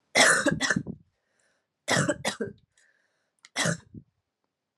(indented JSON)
{
  "three_cough_length": "4.8 s",
  "three_cough_amplitude": 19027,
  "three_cough_signal_mean_std_ratio": 0.4,
  "survey_phase": "alpha (2021-03-01 to 2021-08-12)",
  "age": "18-44",
  "gender": "Female",
  "wearing_mask": "No",
  "symptom_cough_any": true,
  "symptom_new_continuous_cough": true,
  "symptom_fatigue": true,
  "symptom_fever_high_temperature": true,
  "symptom_headache": true,
  "symptom_onset": "3 days",
  "smoker_status": "Never smoked",
  "respiratory_condition_asthma": false,
  "respiratory_condition_other": false,
  "recruitment_source": "Test and Trace",
  "submission_delay": "2 days",
  "covid_test_method": "RT-qPCR"
}